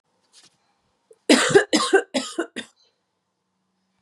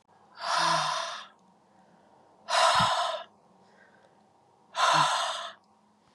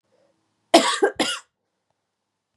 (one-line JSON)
{"three_cough_length": "4.0 s", "three_cough_amplitude": 28615, "three_cough_signal_mean_std_ratio": 0.33, "exhalation_length": "6.1 s", "exhalation_amplitude": 9589, "exhalation_signal_mean_std_ratio": 0.5, "cough_length": "2.6 s", "cough_amplitude": 32145, "cough_signal_mean_std_ratio": 0.3, "survey_phase": "beta (2021-08-13 to 2022-03-07)", "age": "45-64", "gender": "Female", "wearing_mask": "No", "symptom_cough_any": true, "symptom_runny_or_blocked_nose": true, "symptom_loss_of_taste": true, "smoker_status": "Ex-smoker", "respiratory_condition_asthma": false, "respiratory_condition_other": false, "recruitment_source": "Test and Trace", "submission_delay": "3 days", "covid_test_result": "Positive", "covid_test_method": "RT-qPCR", "covid_ct_value": 19.2, "covid_ct_gene": "ORF1ab gene", "covid_ct_mean": 19.7, "covid_viral_load": "350000 copies/ml", "covid_viral_load_category": "Low viral load (10K-1M copies/ml)"}